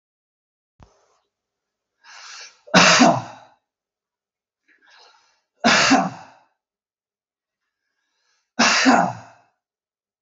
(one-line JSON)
{"three_cough_length": "10.2 s", "three_cough_amplitude": 32768, "three_cough_signal_mean_std_ratio": 0.31, "survey_phase": "beta (2021-08-13 to 2022-03-07)", "age": "45-64", "gender": "Male", "wearing_mask": "No", "symptom_none": true, "smoker_status": "Ex-smoker", "respiratory_condition_asthma": true, "respiratory_condition_other": false, "recruitment_source": "Test and Trace", "submission_delay": "1 day", "covid_test_result": "Negative", "covid_test_method": "ePCR"}